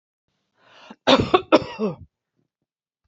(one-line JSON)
{"cough_length": "3.1 s", "cough_amplitude": 27753, "cough_signal_mean_std_ratio": 0.3, "survey_phase": "beta (2021-08-13 to 2022-03-07)", "age": "65+", "gender": "Female", "wearing_mask": "No", "symptom_none": true, "smoker_status": "Never smoked", "respiratory_condition_asthma": false, "respiratory_condition_other": false, "recruitment_source": "Test and Trace", "submission_delay": "2 days", "covid_test_result": "Positive", "covid_test_method": "RT-qPCR", "covid_ct_value": 33.1, "covid_ct_gene": "ORF1ab gene"}